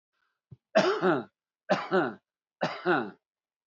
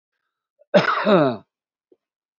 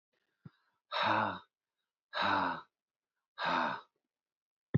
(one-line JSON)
{"three_cough_length": "3.7 s", "three_cough_amplitude": 11415, "three_cough_signal_mean_std_ratio": 0.44, "cough_length": "2.4 s", "cough_amplitude": 25057, "cough_signal_mean_std_ratio": 0.38, "exhalation_length": "4.8 s", "exhalation_amplitude": 4792, "exhalation_signal_mean_std_ratio": 0.43, "survey_phase": "beta (2021-08-13 to 2022-03-07)", "age": "65+", "gender": "Male", "wearing_mask": "No", "symptom_runny_or_blocked_nose": true, "smoker_status": "Current smoker (11 or more cigarettes per day)", "respiratory_condition_asthma": false, "respiratory_condition_other": false, "recruitment_source": "REACT", "submission_delay": "2 days", "covid_test_result": "Negative", "covid_test_method": "RT-qPCR", "influenza_a_test_result": "Negative", "influenza_b_test_result": "Negative"}